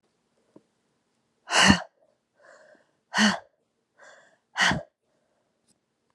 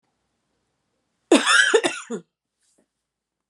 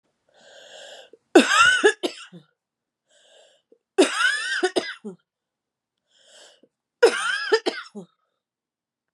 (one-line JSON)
{"exhalation_length": "6.1 s", "exhalation_amplitude": 26379, "exhalation_signal_mean_std_ratio": 0.27, "cough_length": "3.5 s", "cough_amplitude": 28532, "cough_signal_mean_std_ratio": 0.32, "three_cough_length": "9.1 s", "three_cough_amplitude": 28713, "three_cough_signal_mean_std_ratio": 0.34, "survey_phase": "beta (2021-08-13 to 2022-03-07)", "age": "45-64", "gender": "Female", "wearing_mask": "No", "symptom_cough_any": true, "symptom_runny_or_blocked_nose": true, "symptom_sore_throat": true, "symptom_fatigue": true, "symptom_headache": true, "symptom_change_to_sense_of_smell_or_taste": true, "smoker_status": "Never smoked", "respiratory_condition_asthma": false, "respiratory_condition_other": false, "recruitment_source": "Test and Trace", "submission_delay": "1 day", "covid_test_result": "Positive", "covid_test_method": "RT-qPCR", "covid_ct_value": 21.5, "covid_ct_gene": "ORF1ab gene", "covid_ct_mean": 22.0, "covid_viral_load": "60000 copies/ml", "covid_viral_load_category": "Low viral load (10K-1M copies/ml)"}